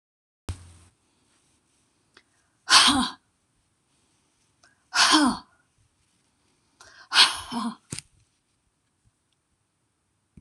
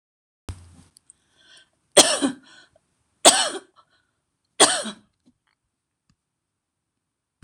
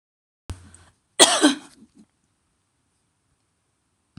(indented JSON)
{
  "exhalation_length": "10.4 s",
  "exhalation_amplitude": 24988,
  "exhalation_signal_mean_std_ratio": 0.27,
  "three_cough_length": "7.4 s",
  "three_cough_amplitude": 26028,
  "three_cough_signal_mean_std_ratio": 0.23,
  "cough_length": "4.2 s",
  "cough_amplitude": 26028,
  "cough_signal_mean_std_ratio": 0.22,
  "survey_phase": "beta (2021-08-13 to 2022-03-07)",
  "age": "65+",
  "gender": "Female",
  "wearing_mask": "No",
  "symptom_none": true,
  "smoker_status": "Never smoked",
  "respiratory_condition_asthma": false,
  "respiratory_condition_other": false,
  "recruitment_source": "REACT",
  "submission_delay": "1 day",
  "covid_test_result": "Negative",
  "covid_test_method": "RT-qPCR"
}